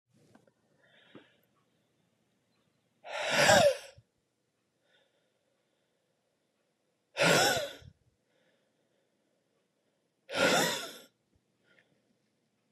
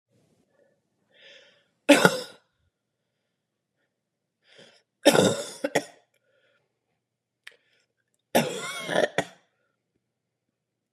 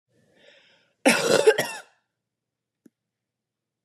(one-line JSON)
{"exhalation_length": "12.7 s", "exhalation_amplitude": 11821, "exhalation_signal_mean_std_ratio": 0.28, "three_cough_length": "10.9 s", "three_cough_amplitude": 30957, "three_cough_signal_mean_std_ratio": 0.24, "cough_length": "3.8 s", "cough_amplitude": 22188, "cough_signal_mean_std_ratio": 0.29, "survey_phase": "beta (2021-08-13 to 2022-03-07)", "age": "18-44", "gender": "Female", "wearing_mask": "No", "symptom_cough_any": true, "symptom_runny_or_blocked_nose": true, "symptom_sore_throat": true, "symptom_fatigue": true, "symptom_fever_high_temperature": true, "symptom_onset": "3 days", "smoker_status": "Never smoked", "respiratory_condition_asthma": false, "respiratory_condition_other": false, "recruitment_source": "Test and Trace", "submission_delay": "1 day", "covid_test_result": "Positive", "covid_test_method": "RT-qPCR", "covid_ct_value": 26.6, "covid_ct_gene": "ORF1ab gene", "covid_ct_mean": 26.8, "covid_viral_load": "1700 copies/ml", "covid_viral_load_category": "Minimal viral load (< 10K copies/ml)"}